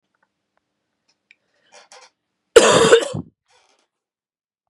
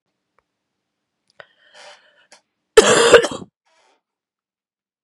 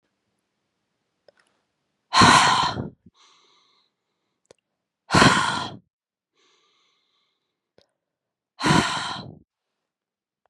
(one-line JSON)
{"three_cough_length": "4.7 s", "three_cough_amplitude": 32768, "three_cough_signal_mean_std_ratio": 0.26, "cough_length": "5.0 s", "cough_amplitude": 32768, "cough_signal_mean_std_ratio": 0.24, "exhalation_length": "10.5 s", "exhalation_amplitude": 31803, "exhalation_signal_mean_std_ratio": 0.3, "survey_phase": "beta (2021-08-13 to 2022-03-07)", "age": "45-64", "gender": "Female", "wearing_mask": "No", "symptom_cough_any": true, "symptom_runny_or_blocked_nose": true, "symptom_shortness_of_breath": true, "symptom_sore_throat": true, "symptom_fatigue": true, "symptom_headache": true, "smoker_status": "Prefer not to say", "respiratory_condition_asthma": false, "respiratory_condition_other": false, "recruitment_source": "Test and Trace", "submission_delay": "1 day", "covid_test_result": "Positive", "covid_test_method": "RT-qPCR"}